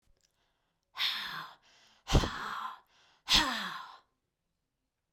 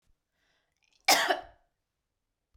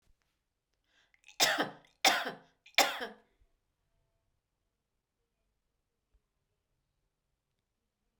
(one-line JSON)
{"exhalation_length": "5.1 s", "exhalation_amplitude": 12395, "exhalation_signal_mean_std_ratio": 0.37, "cough_length": "2.6 s", "cough_amplitude": 13443, "cough_signal_mean_std_ratio": 0.25, "three_cough_length": "8.2 s", "three_cough_amplitude": 13891, "three_cough_signal_mean_std_ratio": 0.22, "survey_phase": "beta (2021-08-13 to 2022-03-07)", "age": "65+", "gender": "Female", "wearing_mask": "No", "symptom_none": true, "smoker_status": "Ex-smoker", "respiratory_condition_asthma": false, "respiratory_condition_other": false, "recruitment_source": "REACT", "submission_delay": "2 days", "covid_test_result": "Negative", "covid_test_method": "RT-qPCR", "influenza_a_test_result": "Negative", "influenza_b_test_result": "Negative"}